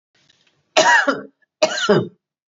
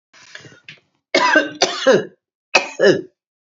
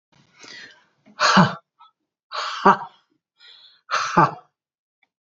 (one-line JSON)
{"cough_length": "2.5 s", "cough_amplitude": 31426, "cough_signal_mean_std_ratio": 0.45, "three_cough_length": "3.5 s", "three_cough_amplitude": 32767, "three_cough_signal_mean_std_ratio": 0.43, "exhalation_length": "5.2 s", "exhalation_amplitude": 32234, "exhalation_signal_mean_std_ratio": 0.33, "survey_phase": "beta (2021-08-13 to 2022-03-07)", "age": "45-64", "gender": "Female", "wearing_mask": "No", "symptom_runny_or_blocked_nose": true, "smoker_status": "Ex-smoker", "respiratory_condition_asthma": false, "respiratory_condition_other": false, "recruitment_source": "REACT", "submission_delay": "2 days", "covid_test_result": "Negative", "covid_test_method": "RT-qPCR", "influenza_a_test_result": "Negative", "influenza_b_test_result": "Negative"}